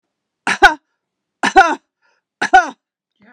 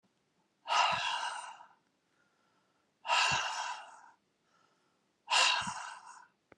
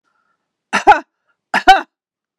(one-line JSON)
{"three_cough_length": "3.3 s", "three_cough_amplitude": 32768, "three_cough_signal_mean_std_ratio": 0.31, "exhalation_length": "6.6 s", "exhalation_amplitude": 6034, "exhalation_signal_mean_std_ratio": 0.44, "cough_length": "2.4 s", "cough_amplitude": 32768, "cough_signal_mean_std_ratio": 0.3, "survey_phase": "beta (2021-08-13 to 2022-03-07)", "age": "45-64", "gender": "Female", "wearing_mask": "No", "symptom_none": true, "smoker_status": "Never smoked", "respiratory_condition_asthma": false, "respiratory_condition_other": false, "recruitment_source": "REACT", "submission_delay": "2 days", "covid_test_result": "Negative", "covid_test_method": "RT-qPCR"}